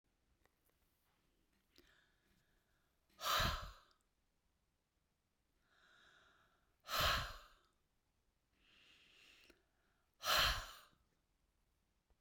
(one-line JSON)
{"exhalation_length": "12.2 s", "exhalation_amplitude": 2422, "exhalation_signal_mean_std_ratio": 0.27, "survey_phase": "beta (2021-08-13 to 2022-03-07)", "age": "45-64", "gender": "Female", "wearing_mask": "No", "symptom_none": true, "smoker_status": "Never smoked", "respiratory_condition_asthma": false, "respiratory_condition_other": false, "recruitment_source": "REACT", "submission_delay": "1 day", "covid_test_result": "Negative", "covid_test_method": "RT-qPCR", "influenza_a_test_result": "Negative", "influenza_b_test_result": "Negative"}